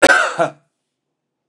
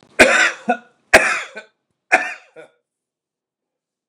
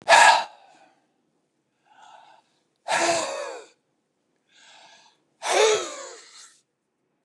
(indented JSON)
{
  "cough_length": "1.5 s",
  "cough_amplitude": 29204,
  "cough_signal_mean_std_ratio": 0.39,
  "three_cough_length": "4.1 s",
  "three_cough_amplitude": 29204,
  "three_cough_signal_mean_std_ratio": 0.34,
  "exhalation_length": "7.2 s",
  "exhalation_amplitude": 27524,
  "exhalation_signal_mean_std_ratio": 0.33,
  "survey_phase": "beta (2021-08-13 to 2022-03-07)",
  "age": "65+",
  "gender": "Male",
  "wearing_mask": "No",
  "symptom_cough_any": true,
  "symptom_runny_or_blocked_nose": true,
  "smoker_status": "Ex-smoker",
  "respiratory_condition_asthma": false,
  "respiratory_condition_other": false,
  "recruitment_source": "REACT",
  "submission_delay": "3 days",
  "covid_test_result": "Negative",
  "covid_test_method": "RT-qPCR",
  "influenza_a_test_result": "Negative",
  "influenza_b_test_result": "Negative"
}